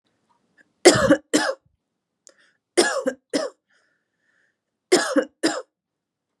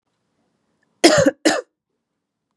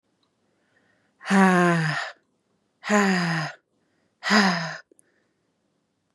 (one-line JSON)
{"three_cough_length": "6.4 s", "three_cough_amplitude": 32423, "three_cough_signal_mean_std_ratio": 0.33, "cough_length": "2.6 s", "cough_amplitude": 32700, "cough_signal_mean_std_ratio": 0.31, "exhalation_length": "6.1 s", "exhalation_amplitude": 24115, "exhalation_signal_mean_std_ratio": 0.43, "survey_phase": "beta (2021-08-13 to 2022-03-07)", "age": "18-44", "gender": "Female", "wearing_mask": "No", "symptom_none": true, "smoker_status": "Never smoked", "respiratory_condition_asthma": false, "respiratory_condition_other": false, "recruitment_source": "REACT", "submission_delay": "2 days", "covid_test_result": "Negative", "covid_test_method": "RT-qPCR", "influenza_a_test_result": "Negative", "influenza_b_test_result": "Negative"}